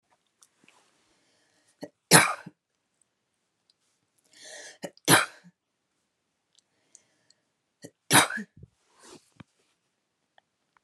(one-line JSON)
{"three_cough_length": "10.8 s", "three_cough_amplitude": 28752, "three_cough_signal_mean_std_ratio": 0.19, "survey_phase": "beta (2021-08-13 to 2022-03-07)", "age": "18-44", "gender": "Female", "wearing_mask": "No", "symptom_cough_any": true, "symptom_runny_or_blocked_nose": true, "symptom_sore_throat": true, "symptom_other": true, "symptom_onset": "3 days", "smoker_status": "Ex-smoker", "respiratory_condition_asthma": false, "respiratory_condition_other": false, "recruitment_source": "Test and Trace", "submission_delay": "2 days", "covid_test_result": "Positive", "covid_test_method": "RT-qPCR", "covid_ct_value": 23.2, "covid_ct_gene": "N gene"}